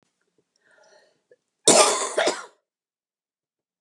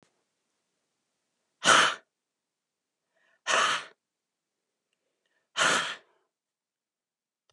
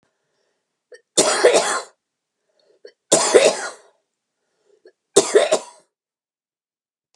{"cough_length": "3.8 s", "cough_amplitude": 32476, "cough_signal_mean_std_ratio": 0.29, "exhalation_length": "7.5 s", "exhalation_amplitude": 16665, "exhalation_signal_mean_std_ratio": 0.27, "three_cough_length": "7.2 s", "three_cough_amplitude": 32768, "three_cough_signal_mean_std_ratio": 0.34, "survey_phase": "beta (2021-08-13 to 2022-03-07)", "age": "45-64", "gender": "Female", "wearing_mask": "No", "symptom_none": true, "smoker_status": "Never smoked", "respiratory_condition_asthma": false, "respiratory_condition_other": false, "recruitment_source": "REACT", "submission_delay": "15 days", "covid_test_result": "Negative", "covid_test_method": "RT-qPCR"}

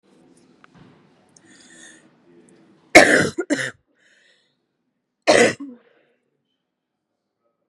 {"three_cough_length": "7.7 s", "three_cough_amplitude": 32768, "three_cough_signal_mean_std_ratio": 0.24, "survey_phase": "beta (2021-08-13 to 2022-03-07)", "age": "45-64", "gender": "Female", "wearing_mask": "No", "symptom_new_continuous_cough": true, "symptom_runny_or_blocked_nose": true, "symptom_diarrhoea": true, "symptom_fatigue": true, "symptom_loss_of_taste": true, "symptom_onset": "5 days", "smoker_status": "Ex-smoker", "respiratory_condition_asthma": false, "respiratory_condition_other": false, "recruitment_source": "Test and Trace", "submission_delay": "3 days", "covid_test_result": "Negative", "covid_test_method": "RT-qPCR"}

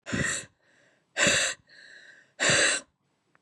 {"exhalation_length": "3.4 s", "exhalation_amplitude": 14528, "exhalation_signal_mean_std_ratio": 0.48, "survey_phase": "beta (2021-08-13 to 2022-03-07)", "age": "18-44", "gender": "Female", "wearing_mask": "No", "symptom_cough_any": true, "symptom_runny_or_blocked_nose": true, "symptom_fatigue": true, "smoker_status": "Never smoked", "respiratory_condition_asthma": false, "respiratory_condition_other": false, "recruitment_source": "Test and Trace", "submission_delay": "2 days", "covid_test_result": "Negative", "covid_test_method": "ePCR"}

